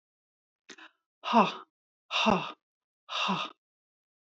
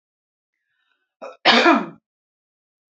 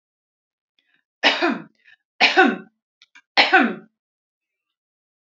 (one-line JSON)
{"exhalation_length": "4.3 s", "exhalation_amplitude": 11067, "exhalation_signal_mean_std_ratio": 0.35, "cough_length": "2.9 s", "cough_amplitude": 28697, "cough_signal_mean_std_ratio": 0.29, "three_cough_length": "5.3 s", "three_cough_amplitude": 28325, "three_cough_signal_mean_std_ratio": 0.33, "survey_phase": "beta (2021-08-13 to 2022-03-07)", "age": "45-64", "gender": "Female", "wearing_mask": "No", "symptom_none": true, "smoker_status": "Ex-smoker", "respiratory_condition_asthma": false, "respiratory_condition_other": false, "recruitment_source": "REACT", "submission_delay": "2 days", "covid_test_result": "Negative", "covid_test_method": "RT-qPCR"}